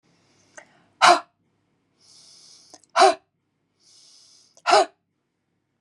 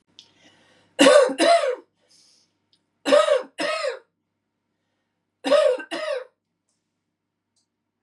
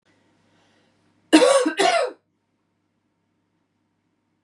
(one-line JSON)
{"exhalation_length": "5.8 s", "exhalation_amplitude": 28797, "exhalation_signal_mean_std_ratio": 0.24, "three_cough_length": "8.0 s", "three_cough_amplitude": 27074, "three_cough_signal_mean_std_ratio": 0.38, "cough_length": "4.4 s", "cough_amplitude": 29914, "cough_signal_mean_std_ratio": 0.31, "survey_phase": "beta (2021-08-13 to 2022-03-07)", "age": "45-64", "gender": "Female", "wearing_mask": "No", "symptom_cough_any": true, "symptom_runny_or_blocked_nose": true, "symptom_change_to_sense_of_smell_or_taste": true, "symptom_loss_of_taste": true, "symptom_onset": "3 days", "smoker_status": "Never smoked", "respiratory_condition_asthma": true, "respiratory_condition_other": false, "recruitment_source": "Test and Trace", "submission_delay": "2 days", "covid_test_result": "Positive", "covid_test_method": "RT-qPCR"}